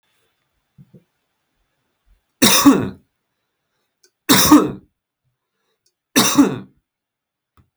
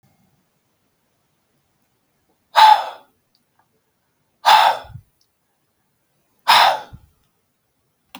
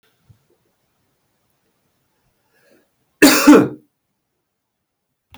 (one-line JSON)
{"three_cough_length": "7.8 s", "three_cough_amplitude": 32768, "three_cough_signal_mean_std_ratio": 0.31, "exhalation_length": "8.2 s", "exhalation_amplitude": 32768, "exhalation_signal_mean_std_ratio": 0.27, "cough_length": "5.4 s", "cough_amplitude": 32768, "cough_signal_mean_std_ratio": 0.23, "survey_phase": "beta (2021-08-13 to 2022-03-07)", "age": "18-44", "gender": "Male", "wearing_mask": "No", "symptom_none": true, "smoker_status": "Ex-smoker", "respiratory_condition_asthma": false, "respiratory_condition_other": false, "recruitment_source": "REACT", "submission_delay": "1 day", "covid_test_result": "Negative", "covid_test_method": "RT-qPCR", "influenza_a_test_result": "Negative", "influenza_b_test_result": "Negative"}